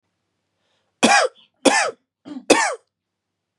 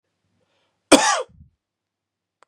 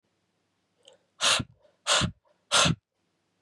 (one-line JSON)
{"three_cough_length": "3.6 s", "three_cough_amplitude": 32767, "three_cough_signal_mean_std_ratio": 0.36, "cough_length": "2.5 s", "cough_amplitude": 32767, "cough_signal_mean_std_ratio": 0.24, "exhalation_length": "3.4 s", "exhalation_amplitude": 13049, "exhalation_signal_mean_std_ratio": 0.36, "survey_phase": "beta (2021-08-13 to 2022-03-07)", "age": "18-44", "gender": "Male", "wearing_mask": "No", "symptom_none": true, "smoker_status": "Never smoked", "respiratory_condition_asthma": false, "respiratory_condition_other": false, "recruitment_source": "REACT", "submission_delay": "3 days", "covid_test_result": "Negative", "covid_test_method": "RT-qPCR", "influenza_a_test_result": "Negative", "influenza_b_test_result": "Negative"}